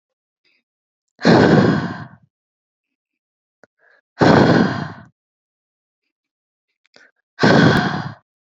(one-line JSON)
{"exhalation_length": "8.5 s", "exhalation_amplitude": 29576, "exhalation_signal_mean_std_ratio": 0.38, "survey_phase": "beta (2021-08-13 to 2022-03-07)", "age": "18-44", "gender": "Female", "wearing_mask": "No", "symptom_none": true, "smoker_status": "Never smoked", "respiratory_condition_asthma": false, "respiratory_condition_other": false, "recruitment_source": "REACT", "submission_delay": "1 day", "covid_test_result": "Negative", "covid_test_method": "RT-qPCR"}